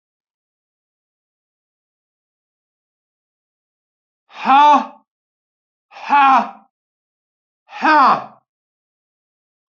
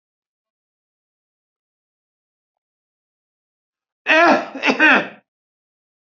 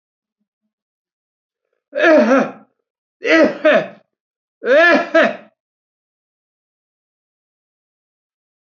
{"exhalation_length": "9.7 s", "exhalation_amplitude": 26535, "exhalation_signal_mean_std_ratio": 0.29, "cough_length": "6.1 s", "cough_amplitude": 30844, "cough_signal_mean_std_ratio": 0.27, "three_cough_length": "8.8 s", "three_cough_amplitude": 31464, "three_cough_signal_mean_std_ratio": 0.35, "survey_phase": "beta (2021-08-13 to 2022-03-07)", "age": "65+", "gender": "Male", "wearing_mask": "No", "symptom_none": true, "smoker_status": "Never smoked", "respiratory_condition_asthma": true, "respiratory_condition_other": false, "recruitment_source": "REACT", "submission_delay": "1 day", "covid_test_result": "Negative", "covid_test_method": "RT-qPCR"}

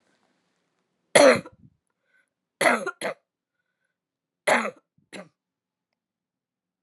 {"three_cough_length": "6.8 s", "three_cough_amplitude": 28202, "three_cough_signal_mean_std_ratio": 0.24, "survey_phase": "alpha (2021-03-01 to 2021-08-12)", "age": "18-44", "gender": "Female", "wearing_mask": "No", "symptom_cough_any": true, "symptom_shortness_of_breath": true, "symptom_fever_high_temperature": true, "symptom_headache": true, "symptom_change_to_sense_of_smell_or_taste": true, "symptom_onset": "6 days", "smoker_status": "Never smoked", "respiratory_condition_asthma": false, "respiratory_condition_other": false, "recruitment_source": "Test and Trace", "submission_delay": "2 days", "covid_test_result": "Positive", "covid_test_method": "RT-qPCR"}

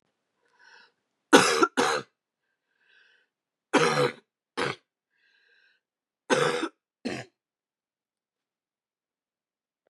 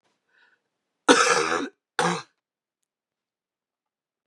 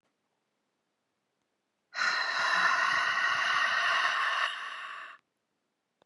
{"three_cough_length": "9.9 s", "three_cough_amplitude": 27341, "three_cough_signal_mean_std_ratio": 0.28, "cough_length": "4.3 s", "cough_amplitude": 30167, "cough_signal_mean_std_ratio": 0.31, "exhalation_length": "6.1 s", "exhalation_amplitude": 5974, "exhalation_signal_mean_std_ratio": 0.64, "survey_phase": "beta (2021-08-13 to 2022-03-07)", "age": "18-44", "gender": "Female", "wearing_mask": "No", "symptom_cough_any": true, "symptom_runny_or_blocked_nose": true, "symptom_sore_throat": true, "symptom_diarrhoea": true, "symptom_headache": true, "symptom_other": true, "smoker_status": "Never smoked", "respiratory_condition_asthma": true, "respiratory_condition_other": false, "recruitment_source": "Test and Trace", "submission_delay": "2 days", "covid_test_result": "Positive", "covid_test_method": "LFT"}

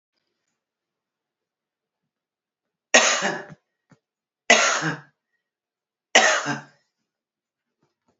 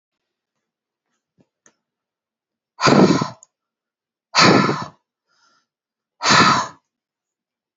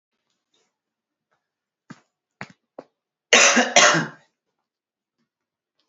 {"three_cough_length": "8.2 s", "three_cough_amplitude": 29415, "three_cough_signal_mean_std_ratio": 0.28, "exhalation_length": "7.8 s", "exhalation_amplitude": 32365, "exhalation_signal_mean_std_ratio": 0.32, "cough_length": "5.9 s", "cough_amplitude": 32767, "cough_signal_mean_std_ratio": 0.26, "survey_phase": "beta (2021-08-13 to 2022-03-07)", "age": "45-64", "gender": "Female", "wearing_mask": "No", "symptom_none": true, "smoker_status": "Current smoker (11 or more cigarettes per day)", "respiratory_condition_asthma": false, "respiratory_condition_other": false, "recruitment_source": "REACT", "submission_delay": "1 day", "covid_test_result": "Negative", "covid_test_method": "RT-qPCR", "influenza_a_test_result": "Negative", "influenza_b_test_result": "Negative"}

